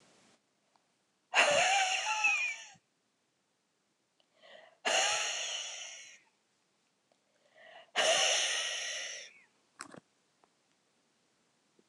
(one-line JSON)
{"exhalation_length": "11.9 s", "exhalation_amplitude": 8351, "exhalation_signal_mean_std_ratio": 0.44, "survey_phase": "beta (2021-08-13 to 2022-03-07)", "age": "45-64", "gender": "Female", "wearing_mask": "No", "symptom_none": true, "smoker_status": "Never smoked", "respiratory_condition_asthma": false, "respiratory_condition_other": false, "recruitment_source": "REACT", "submission_delay": "1 day", "covid_test_result": "Negative", "covid_test_method": "RT-qPCR", "influenza_a_test_result": "Unknown/Void", "influenza_b_test_result": "Unknown/Void"}